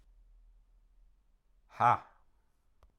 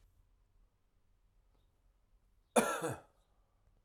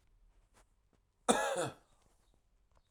{
  "exhalation_length": "3.0 s",
  "exhalation_amplitude": 7248,
  "exhalation_signal_mean_std_ratio": 0.21,
  "three_cough_length": "3.8 s",
  "three_cough_amplitude": 6008,
  "three_cough_signal_mean_std_ratio": 0.24,
  "cough_length": "2.9 s",
  "cough_amplitude": 7606,
  "cough_signal_mean_std_ratio": 0.3,
  "survey_phase": "alpha (2021-03-01 to 2021-08-12)",
  "age": "45-64",
  "gender": "Male",
  "wearing_mask": "No",
  "symptom_none": true,
  "smoker_status": "Ex-smoker",
  "respiratory_condition_asthma": false,
  "respiratory_condition_other": false,
  "recruitment_source": "REACT",
  "submission_delay": "1 day",
  "covid_test_result": "Negative",
  "covid_test_method": "RT-qPCR"
}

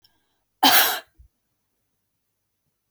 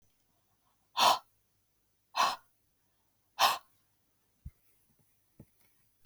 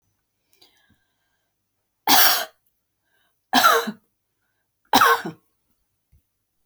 {
  "cough_length": "2.9 s",
  "cough_amplitude": 31013,
  "cough_signal_mean_std_ratio": 0.26,
  "exhalation_length": "6.1 s",
  "exhalation_amplitude": 8153,
  "exhalation_signal_mean_std_ratio": 0.24,
  "three_cough_length": "6.7 s",
  "three_cough_amplitude": 31387,
  "three_cough_signal_mean_std_ratio": 0.3,
  "survey_phase": "beta (2021-08-13 to 2022-03-07)",
  "age": "45-64",
  "gender": "Female",
  "wearing_mask": "No",
  "symptom_none": true,
  "smoker_status": "Never smoked",
  "respiratory_condition_asthma": false,
  "respiratory_condition_other": false,
  "recruitment_source": "REACT",
  "submission_delay": "1 day",
  "covid_test_result": "Negative",
  "covid_test_method": "RT-qPCR",
  "influenza_a_test_result": "Negative",
  "influenza_b_test_result": "Negative"
}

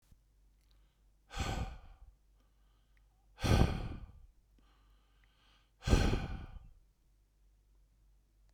{
  "exhalation_length": "8.5 s",
  "exhalation_amplitude": 7527,
  "exhalation_signal_mean_std_ratio": 0.32,
  "survey_phase": "beta (2021-08-13 to 2022-03-07)",
  "age": "45-64",
  "gender": "Male",
  "wearing_mask": "No",
  "symptom_none": true,
  "smoker_status": "Never smoked",
  "respiratory_condition_asthma": false,
  "respiratory_condition_other": false,
  "recruitment_source": "REACT",
  "submission_delay": "1 day",
  "covid_test_result": "Negative",
  "covid_test_method": "RT-qPCR"
}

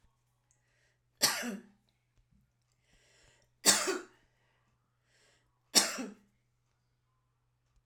{
  "three_cough_length": "7.9 s",
  "three_cough_amplitude": 12103,
  "three_cough_signal_mean_std_ratio": 0.24,
  "survey_phase": "alpha (2021-03-01 to 2021-08-12)",
  "age": "45-64",
  "gender": "Female",
  "wearing_mask": "No",
  "symptom_cough_any": true,
  "symptom_fatigue": true,
  "symptom_fever_high_temperature": true,
  "symptom_onset": "3 days",
  "smoker_status": "Never smoked",
  "respiratory_condition_asthma": false,
  "respiratory_condition_other": false,
  "recruitment_source": "Test and Trace",
  "submission_delay": "1 day",
  "covid_test_result": "Positive",
  "covid_test_method": "RT-qPCR"
}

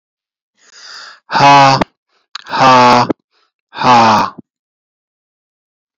{
  "exhalation_length": "6.0 s",
  "exhalation_amplitude": 30155,
  "exhalation_signal_mean_std_ratio": 0.47,
  "survey_phase": "beta (2021-08-13 to 2022-03-07)",
  "age": "45-64",
  "gender": "Male",
  "wearing_mask": "No",
  "symptom_none": true,
  "smoker_status": "Never smoked",
  "respiratory_condition_asthma": false,
  "respiratory_condition_other": false,
  "recruitment_source": "REACT",
  "submission_delay": "1 day",
  "covid_test_result": "Negative",
  "covid_test_method": "RT-qPCR",
  "influenza_a_test_result": "Negative",
  "influenza_b_test_result": "Negative"
}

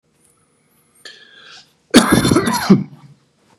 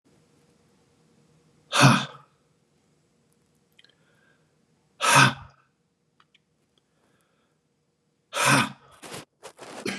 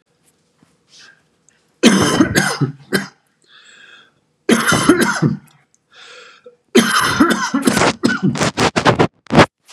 {
  "cough_length": "3.6 s",
  "cough_amplitude": 32768,
  "cough_signal_mean_std_ratio": 0.37,
  "exhalation_length": "10.0 s",
  "exhalation_amplitude": 24091,
  "exhalation_signal_mean_std_ratio": 0.26,
  "three_cough_length": "9.7 s",
  "three_cough_amplitude": 32768,
  "three_cough_signal_mean_std_ratio": 0.51,
  "survey_phase": "beta (2021-08-13 to 2022-03-07)",
  "age": "45-64",
  "gender": "Male",
  "wearing_mask": "No",
  "symptom_cough_any": true,
  "symptom_new_continuous_cough": true,
  "symptom_shortness_of_breath": true,
  "symptom_headache": true,
  "symptom_change_to_sense_of_smell_or_taste": true,
  "symptom_other": true,
  "smoker_status": "Never smoked",
  "respiratory_condition_asthma": true,
  "respiratory_condition_other": false,
  "recruitment_source": "Test and Trace",
  "submission_delay": "0 days",
  "covid_test_result": "Positive",
  "covid_test_method": "LFT"
}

